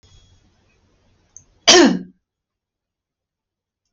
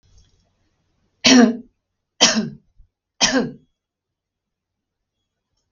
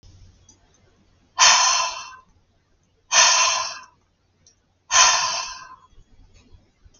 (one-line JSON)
{"cough_length": "3.9 s", "cough_amplitude": 32768, "cough_signal_mean_std_ratio": 0.23, "three_cough_length": "5.7 s", "three_cough_amplitude": 32768, "three_cough_signal_mean_std_ratio": 0.29, "exhalation_length": "7.0 s", "exhalation_amplitude": 32692, "exhalation_signal_mean_std_ratio": 0.4, "survey_phase": "beta (2021-08-13 to 2022-03-07)", "age": "65+", "gender": "Female", "wearing_mask": "No", "symptom_none": true, "smoker_status": "Never smoked", "respiratory_condition_asthma": false, "respiratory_condition_other": false, "recruitment_source": "REACT", "submission_delay": "1 day", "covid_test_result": "Negative", "covid_test_method": "RT-qPCR", "influenza_a_test_result": "Negative", "influenza_b_test_result": "Negative"}